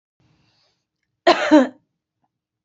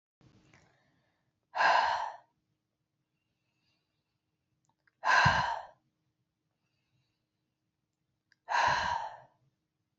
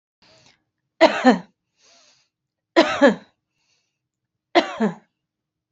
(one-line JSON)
{"cough_length": "2.6 s", "cough_amplitude": 28075, "cough_signal_mean_std_ratio": 0.28, "exhalation_length": "10.0 s", "exhalation_amplitude": 8497, "exhalation_signal_mean_std_ratio": 0.32, "three_cough_length": "5.7 s", "three_cough_amplitude": 28291, "three_cough_signal_mean_std_ratio": 0.29, "survey_phase": "beta (2021-08-13 to 2022-03-07)", "age": "45-64", "gender": "Female", "wearing_mask": "No", "symptom_fatigue": true, "smoker_status": "Ex-smoker", "respiratory_condition_asthma": false, "respiratory_condition_other": false, "recruitment_source": "REACT", "submission_delay": "3 days", "covid_test_result": "Negative", "covid_test_method": "RT-qPCR", "influenza_a_test_result": "Negative", "influenza_b_test_result": "Negative"}